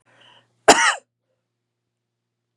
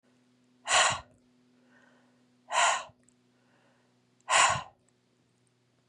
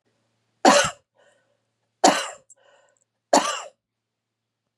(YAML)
cough_length: 2.6 s
cough_amplitude: 32768
cough_signal_mean_std_ratio: 0.23
exhalation_length: 5.9 s
exhalation_amplitude: 10567
exhalation_signal_mean_std_ratio: 0.32
three_cough_length: 4.8 s
three_cough_amplitude: 30476
three_cough_signal_mean_std_ratio: 0.28
survey_phase: beta (2021-08-13 to 2022-03-07)
age: 45-64
gender: Female
wearing_mask: 'No'
symptom_none: true
smoker_status: Never smoked
respiratory_condition_asthma: false
respiratory_condition_other: false
recruitment_source: REACT
submission_delay: 2 days
covid_test_result: Negative
covid_test_method: RT-qPCR
influenza_a_test_result: Negative
influenza_b_test_result: Negative